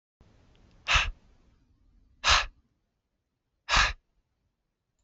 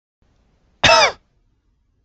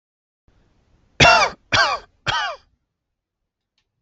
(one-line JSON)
{"exhalation_length": "5.0 s", "exhalation_amplitude": 14546, "exhalation_signal_mean_std_ratio": 0.29, "cough_length": "2.0 s", "cough_amplitude": 27918, "cough_signal_mean_std_ratio": 0.3, "three_cough_length": "4.0 s", "three_cough_amplitude": 28481, "three_cough_signal_mean_std_ratio": 0.33, "survey_phase": "alpha (2021-03-01 to 2021-08-12)", "age": "18-44", "gender": "Male", "wearing_mask": "No", "symptom_diarrhoea": true, "symptom_onset": "12 days", "smoker_status": "Ex-smoker", "respiratory_condition_asthma": false, "respiratory_condition_other": false, "recruitment_source": "REACT", "submission_delay": "1 day", "covid_test_result": "Negative", "covid_test_method": "RT-qPCR"}